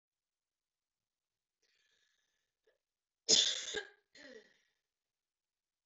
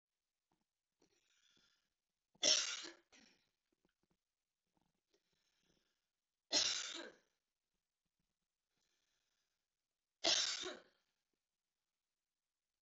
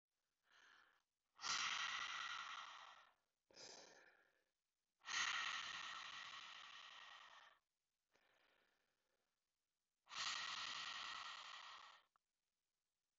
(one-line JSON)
{"cough_length": "5.9 s", "cough_amplitude": 6817, "cough_signal_mean_std_ratio": 0.2, "three_cough_length": "12.8 s", "three_cough_amplitude": 3480, "three_cough_signal_mean_std_ratio": 0.23, "exhalation_length": "13.2 s", "exhalation_amplitude": 859, "exhalation_signal_mean_std_ratio": 0.5, "survey_phase": "beta (2021-08-13 to 2022-03-07)", "age": "18-44", "gender": "Female", "wearing_mask": "No", "symptom_cough_any": true, "symptom_sore_throat": true, "symptom_fatigue": true, "symptom_fever_high_temperature": true, "symptom_headache": true, "symptom_onset": "4 days", "smoker_status": "Never smoked", "respiratory_condition_asthma": false, "respiratory_condition_other": false, "recruitment_source": "Test and Trace", "submission_delay": "2 days", "covid_test_result": "Positive", "covid_test_method": "RT-qPCR", "covid_ct_value": 23.5, "covid_ct_gene": "ORF1ab gene"}